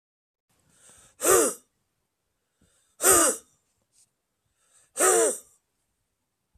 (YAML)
exhalation_length: 6.6 s
exhalation_amplitude: 19883
exhalation_signal_mean_std_ratio: 0.32
survey_phase: beta (2021-08-13 to 2022-03-07)
age: 45-64
gender: Male
wearing_mask: 'No'
symptom_cough_any: true
symptom_runny_or_blocked_nose: true
symptom_shortness_of_breath: true
symptom_sore_throat: true
symptom_fatigue: true
symptom_headache: true
symptom_onset: 3 days
smoker_status: Never smoked
respiratory_condition_asthma: false
respiratory_condition_other: false
recruitment_source: Test and Trace
submission_delay: 1 day
covid_test_result: Positive
covid_test_method: ePCR